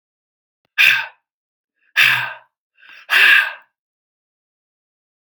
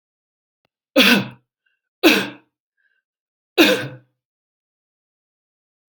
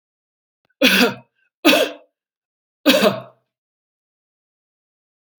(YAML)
exhalation_length: 5.4 s
exhalation_amplitude: 30608
exhalation_signal_mean_std_ratio: 0.33
three_cough_length: 5.9 s
three_cough_amplitude: 32768
three_cough_signal_mean_std_ratio: 0.28
cough_length: 5.4 s
cough_amplitude: 32767
cough_signal_mean_std_ratio: 0.31
survey_phase: alpha (2021-03-01 to 2021-08-12)
age: 65+
gender: Male
wearing_mask: 'No'
symptom_none: true
smoker_status: Never smoked
respiratory_condition_asthma: false
respiratory_condition_other: false
recruitment_source: REACT
submission_delay: 1 day
covid_test_result: Negative
covid_test_method: RT-qPCR